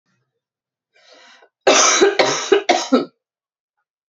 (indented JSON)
{
  "three_cough_length": "4.1 s",
  "three_cough_amplitude": 31449,
  "three_cough_signal_mean_std_ratio": 0.42,
  "survey_phase": "beta (2021-08-13 to 2022-03-07)",
  "age": "18-44",
  "gender": "Female",
  "wearing_mask": "No",
  "symptom_runny_or_blocked_nose": true,
  "symptom_headache": true,
  "symptom_other": true,
  "smoker_status": "Never smoked",
  "respiratory_condition_asthma": true,
  "respiratory_condition_other": false,
  "recruitment_source": "Test and Trace",
  "submission_delay": "1 day",
  "covid_test_result": "Positive",
  "covid_test_method": "RT-qPCR",
  "covid_ct_value": 28.3,
  "covid_ct_gene": "ORF1ab gene",
  "covid_ct_mean": 28.9,
  "covid_viral_load": "340 copies/ml",
  "covid_viral_load_category": "Minimal viral load (< 10K copies/ml)"
}